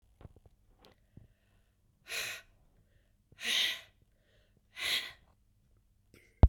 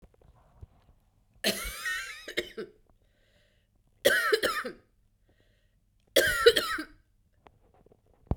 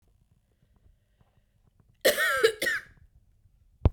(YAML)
exhalation_length: 6.5 s
exhalation_amplitude: 13866
exhalation_signal_mean_std_ratio: 0.22
three_cough_length: 8.4 s
three_cough_amplitude: 20526
three_cough_signal_mean_std_ratio: 0.34
cough_length: 3.9 s
cough_amplitude: 16679
cough_signal_mean_std_ratio: 0.32
survey_phase: beta (2021-08-13 to 2022-03-07)
age: 45-64
gender: Female
wearing_mask: 'No'
symptom_runny_or_blocked_nose: true
symptom_abdominal_pain: true
symptom_fatigue: true
symptom_headache: true
symptom_change_to_sense_of_smell_or_taste: true
symptom_loss_of_taste: true
symptom_onset: 3 days
smoker_status: Never smoked
respiratory_condition_asthma: false
respiratory_condition_other: false
recruitment_source: Test and Trace
submission_delay: 2 days
covid_test_result: Positive
covid_test_method: RT-qPCR
covid_ct_value: 24.8
covid_ct_gene: ORF1ab gene
covid_ct_mean: 26.0
covid_viral_load: 3000 copies/ml
covid_viral_load_category: Minimal viral load (< 10K copies/ml)